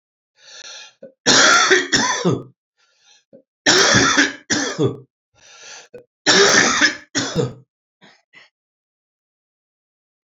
{"three_cough_length": "10.2 s", "three_cough_amplitude": 31756, "three_cough_signal_mean_std_ratio": 0.45, "survey_phase": "alpha (2021-03-01 to 2021-08-12)", "age": "65+", "gender": "Male", "wearing_mask": "No", "symptom_cough_any": true, "symptom_fatigue": true, "symptom_headache": true, "symptom_onset": "2 days", "smoker_status": "Ex-smoker", "respiratory_condition_asthma": false, "respiratory_condition_other": false, "recruitment_source": "Test and Trace", "submission_delay": "1 day", "covid_test_result": "Positive", "covid_test_method": "RT-qPCR", "covid_ct_value": 17.4, "covid_ct_gene": "ORF1ab gene", "covid_ct_mean": 18.3, "covid_viral_load": "1000000 copies/ml", "covid_viral_load_category": "High viral load (>1M copies/ml)"}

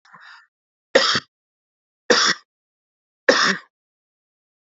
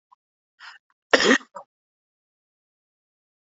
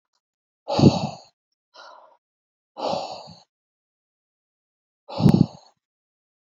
{"three_cough_length": "4.7 s", "three_cough_amplitude": 28160, "three_cough_signal_mean_std_ratio": 0.31, "cough_length": "3.4 s", "cough_amplitude": 27545, "cough_signal_mean_std_ratio": 0.21, "exhalation_length": "6.6 s", "exhalation_amplitude": 26607, "exhalation_signal_mean_std_ratio": 0.25, "survey_phase": "beta (2021-08-13 to 2022-03-07)", "age": "45-64", "gender": "Male", "wearing_mask": "No", "symptom_none": true, "smoker_status": "Never smoked", "respiratory_condition_asthma": false, "respiratory_condition_other": true, "recruitment_source": "REACT", "submission_delay": "2 days", "covid_test_result": "Negative", "covid_test_method": "RT-qPCR", "influenza_a_test_result": "Negative", "influenza_b_test_result": "Negative"}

